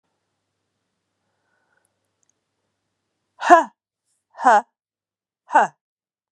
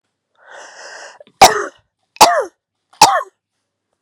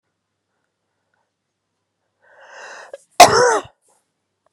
exhalation_length: 6.3 s
exhalation_amplitude: 32249
exhalation_signal_mean_std_ratio: 0.21
three_cough_length: 4.0 s
three_cough_amplitude: 32768
three_cough_signal_mean_std_ratio: 0.31
cough_length: 4.5 s
cough_amplitude: 32768
cough_signal_mean_std_ratio: 0.22
survey_phase: beta (2021-08-13 to 2022-03-07)
age: 45-64
gender: Female
wearing_mask: 'No'
symptom_cough_any: true
symptom_sore_throat: true
symptom_fatigue: true
symptom_headache: true
symptom_other: true
smoker_status: Never smoked
respiratory_condition_asthma: false
respiratory_condition_other: false
recruitment_source: Test and Trace
submission_delay: 2 days
covid_test_result: Positive
covid_test_method: RT-qPCR
covid_ct_value: 15.7
covid_ct_gene: ORF1ab gene
covid_ct_mean: 16.1
covid_viral_load: 5400000 copies/ml
covid_viral_load_category: High viral load (>1M copies/ml)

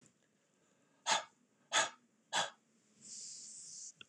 exhalation_length: 4.1 s
exhalation_amplitude: 4181
exhalation_signal_mean_std_ratio: 0.34
survey_phase: beta (2021-08-13 to 2022-03-07)
age: 65+
gender: Male
wearing_mask: 'No'
symptom_runny_or_blocked_nose: true
symptom_sore_throat: true
smoker_status: Never smoked
respiratory_condition_asthma: false
respiratory_condition_other: false
recruitment_source: Test and Trace
submission_delay: 1 day
covid_test_result: Negative
covid_test_method: RT-qPCR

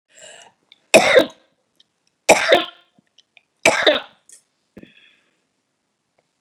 three_cough_length: 6.4 s
three_cough_amplitude: 32768
three_cough_signal_mean_std_ratio: 0.28
survey_phase: beta (2021-08-13 to 2022-03-07)
age: 65+
gender: Female
wearing_mask: 'No'
symptom_none: true
smoker_status: Never smoked
respiratory_condition_asthma: false
respiratory_condition_other: false
recruitment_source: REACT
submission_delay: 3 days
covid_test_result: Negative
covid_test_method: RT-qPCR
influenza_a_test_result: Negative
influenza_b_test_result: Negative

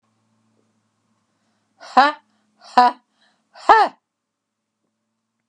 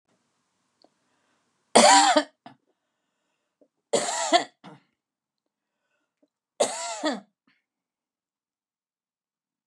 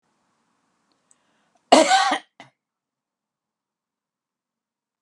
exhalation_length: 5.5 s
exhalation_amplitude: 32768
exhalation_signal_mean_std_ratio: 0.23
three_cough_length: 9.7 s
three_cough_amplitude: 25937
three_cough_signal_mean_std_ratio: 0.26
cough_length: 5.0 s
cough_amplitude: 32768
cough_signal_mean_std_ratio: 0.22
survey_phase: beta (2021-08-13 to 2022-03-07)
age: 65+
gender: Female
wearing_mask: 'No'
symptom_none: true
smoker_status: Ex-smoker
respiratory_condition_asthma: false
respiratory_condition_other: false
recruitment_source: REACT
submission_delay: 1 day
covid_test_result: Negative
covid_test_method: RT-qPCR
influenza_a_test_result: Unknown/Void
influenza_b_test_result: Unknown/Void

